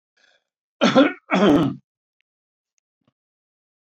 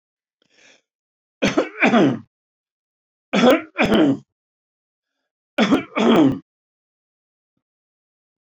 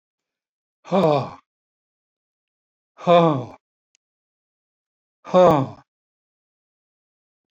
{
  "cough_length": "3.9 s",
  "cough_amplitude": 22666,
  "cough_signal_mean_std_ratio": 0.34,
  "three_cough_length": "8.5 s",
  "three_cough_amplitude": 26026,
  "three_cough_signal_mean_std_ratio": 0.39,
  "exhalation_length": "7.5 s",
  "exhalation_amplitude": 23566,
  "exhalation_signal_mean_std_ratio": 0.28,
  "survey_phase": "alpha (2021-03-01 to 2021-08-12)",
  "age": "65+",
  "gender": "Male",
  "wearing_mask": "No",
  "symptom_none": true,
  "smoker_status": "Ex-smoker",
  "respiratory_condition_asthma": false,
  "respiratory_condition_other": false,
  "recruitment_source": "REACT",
  "submission_delay": "2 days",
  "covid_test_result": "Negative",
  "covid_test_method": "RT-qPCR"
}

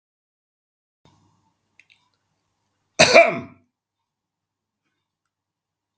{
  "cough_length": "6.0 s",
  "cough_amplitude": 32768,
  "cough_signal_mean_std_ratio": 0.18,
  "survey_phase": "beta (2021-08-13 to 2022-03-07)",
  "age": "65+",
  "gender": "Male",
  "wearing_mask": "No",
  "symptom_none": true,
  "smoker_status": "Ex-smoker",
  "respiratory_condition_asthma": false,
  "respiratory_condition_other": false,
  "recruitment_source": "Test and Trace",
  "submission_delay": "1 day",
  "covid_test_result": "Negative",
  "covid_test_method": "RT-qPCR"
}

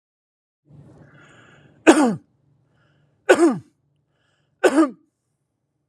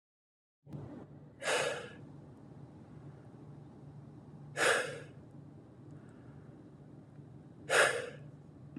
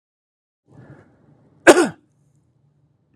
{
  "three_cough_length": "5.9 s",
  "three_cough_amplitude": 32768,
  "three_cough_signal_mean_std_ratio": 0.29,
  "exhalation_length": "8.8 s",
  "exhalation_amplitude": 6532,
  "exhalation_signal_mean_std_ratio": 0.43,
  "cough_length": "3.2 s",
  "cough_amplitude": 32768,
  "cough_signal_mean_std_ratio": 0.19,
  "survey_phase": "alpha (2021-03-01 to 2021-08-12)",
  "age": "18-44",
  "gender": "Male",
  "wearing_mask": "Yes",
  "symptom_fatigue": true,
  "symptom_onset": "11 days",
  "smoker_status": "Never smoked",
  "respiratory_condition_asthma": false,
  "respiratory_condition_other": false,
  "recruitment_source": "REACT",
  "submission_delay": "1 day",
  "covid_test_result": "Negative",
  "covid_test_method": "RT-qPCR"
}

